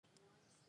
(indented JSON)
{
  "cough_length": "0.7 s",
  "cough_amplitude": 108,
  "cough_signal_mean_std_ratio": 1.11,
  "survey_phase": "alpha (2021-03-01 to 2021-08-12)",
  "age": "45-64",
  "gender": "Female",
  "wearing_mask": "No",
  "symptom_change_to_sense_of_smell_or_taste": true,
  "symptom_onset": "4 days",
  "smoker_status": "Never smoked",
  "respiratory_condition_asthma": false,
  "respiratory_condition_other": false,
  "recruitment_source": "Test and Trace",
  "submission_delay": "1 day",
  "covid_test_result": "Positive",
  "covid_test_method": "RT-qPCR",
  "covid_ct_value": 20.5,
  "covid_ct_gene": "ORF1ab gene",
  "covid_ct_mean": 22.1,
  "covid_viral_load": "55000 copies/ml",
  "covid_viral_load_category": "Low viral load (10K-1M copies/ml)"
}